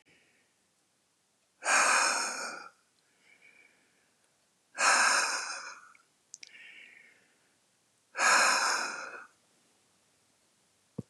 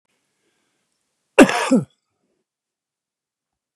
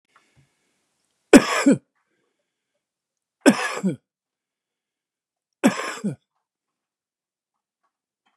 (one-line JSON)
{"exhalation_length": "11.1 s", "exhalation_amplitude": 8589, "exhalation_signal_mean_std_ratio": 0.39, "cough_length": "3.8 s", "cough_amplitude": 32768, "cough_signal_mean_std_ratio": 0.21, "three_cough_length": "8.4 s", "three_cough_amplitude": 32767, "three_cough_signal_mean_std_ratio": 0.22, "survey_phase": "beta (2021-08-13 to 2022-03-07)", "age": "65+", "gender": "Male", "wearing_mask": "No", "symptom_none": true, "smoker_status": "Never smoked", "respiratory_condition_asthma": true, "respiratory_condition_other": false, "recruitment_source": "REACT", "submission_delay": "0 days", "covid_test_result": "Negative", "covid_test_method": "RT-qPCR", "influenza_a_test_result": "Negative", "influenza_b_test_result": "Negative"}